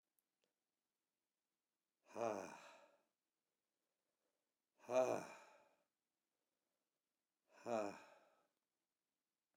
{"exhalation_length": "9.6 s", "exhalation_amplitude": 1579, "exhalation_signal_mean_std_ratio": 0.24, "survey_phase": "alpha (2021-03-01 to 2021-08-12)", "age": "65+", "gender": "Male", "wearing_mask": "No", "symptom_none": true, "smoker_status": "Ex-smoker", "respiratory_condition_asthma": false, "respiratory_condition_other": false, "recruitment_source": "REACT", "submission_delay": "2 days", "covid_test_result": "Negative", "covid_test_method": "RT-qPCR"}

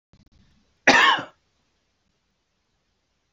{"cough_length": "3.3 s", "cough_amplitude": 27380, "cough_signal_mean_std_ratio": 0.25, "survey_phase": "beta (2021-08-13 to 2022-03-07)", "age": "65+", "gender": "Male", "wearing_mask": "No", "symptom_change_to_sense_of_smell_or_taste": true, "smoker_status": "Never smoked", "respiratory_condition_asthma": false, "respiratory_condition_other": false, "recruitment_source": "REACT", "submission_delay": "1 day", "covid_test_result": "Negative", "covid_test_method": "RT-qPCR"}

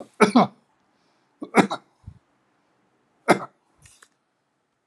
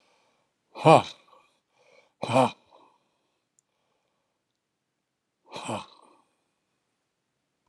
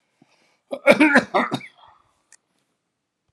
{"three_cough_length": "4.9 s", "three_cough_amplitude": 31265, "three_cough_signal_mean_std_ratio": 0.23, "exhalation_length": "7.7 s", "exhalation_amplitude": 22396, "exhalation_signal_mean_std_ratio": 0.18, "cough_length": "3.3 s", "cough_amplitude": 32768, "cough_signal_mean_std_ratio": 0.31, "survey_phase": "beta (2021-08-13 to 2022-03-07)", "age": "65+", "gender": "Male", "wearing_mask": "No", "symptom_none": true, "smoker_status": "Ex-smoker", "respiratory_condition_asthma": true, "respiratory_condition_other": false, "recruitment_source": "REACT", "submission_delay": "0 days", "covid_test_result": "Negative", "covid_test_method": "RT-qPCR", "influenza_a_test_result": "Negative", "influenza_b_test_result": "Negative"}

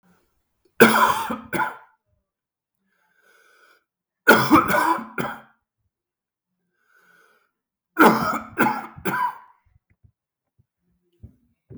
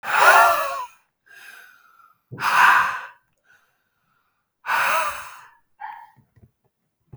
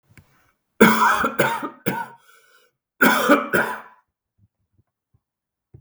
{"three_cough_length": "11.8 s", "three_cough_amplitude": 32768, "three_cough_signal_mean_std_ratio": 0.33, "exhalation_length": "7.2 s", "exhalation_amplitude": 32318, "exhalation_signal_mean_std_ratio": 0.4, "cough_length": "5.8 s", "cough_amplitude": 32768, "cough_signal_mean_std_ratio": 0.4, "survey_phase": "beta (2021-08-13 to 2022-03-07)", "age": "18-44", "gender": "Male", "wearing_mask": "No", "symptom_cough_any": true, "symptom_runny_or_blocked_nose": true, "symptom_other": true, "smoker_status": "Never smoked", "respiratory_condition_asthma": true, "respiratory_condition_other": false, "recruitment_source": "Test and Trace", "submission_delay": "0 days", "covid_test_result": "Positive", "covid_test_method": "LFT"}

